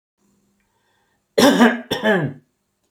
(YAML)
cough_length: 2.9 s
cough_amplitude: 29770
cough_signal_mean_std_ratio: 0.4
survey_phase: alpha (2021-03-01 to 2021-08-12)
age: 45-64
gender: Male
wearing_mask: 'No'
symptom_none: true
smoker_status: Never smoked
respiratory_condition_asthma: false
respiratory_condition_other: false
recruitment_source: REACT
submission_delay: 2 days
covid_test_result: Negative
covid_test_method: RT-qPCR